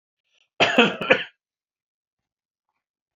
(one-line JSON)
{"cough_length": "3.2 s", "cough_amplitude": 28656, "cough_signal_mean_std_ratio": 0.28, "survey_phase": "beta (2021-08-13 to 2022-03-07)", "age": "45-64", "gender": "Male", "wearing_mask": "No", "symptom_runny_or_blocked_nose": true, "symptom_sore_throat": true, "symptom_headache": true, "symptom_other": true, "smoker_status": "Never smoked", "respiratory_condition_asthma": false, "respiratory_condition_other": false, "recruitment_source": "Test and Trace", "submission_delay": "1 day", "covid_test_result": "Positive", "covid_test_method": "ePCR"}